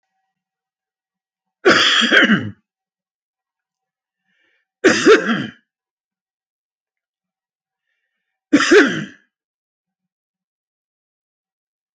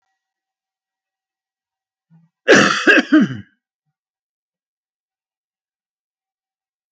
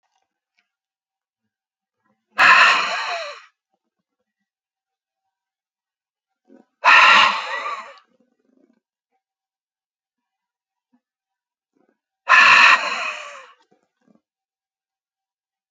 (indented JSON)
{
  "three_cough_length": "11.9 s",
  "three_cough_amplitude": 31414,
  "three_cough_signal_mean_std_ratio": 0.3,
  "cough_length": "6.9 s",
  "cough_amplitude": 30232,
  "cough_signal_mean_std_ratio": 0.25,
  "exhalation_length": "15.7 s",
  "exhalation_amplitude": 30392,
  "exhalation_signal_mean_std_ratio": 0.29,
  "survey_phase": "beta (2021-08-13 to 2022-03-07)",
  "age": "45-64",
  "gender": "Male",
  "wearing_mask": "No",
  "symptom_none": true,
  "smoker_status": "Never smoked",
  "respiratory_condition_asthma": false,
  "respiratory_condition_other": false,
  "recruitment_source": "REACT",
  "submission_delay": "2 days",
  "covid_test_result": "Negative",
  "covid_test_method": "RT-qPCR"
}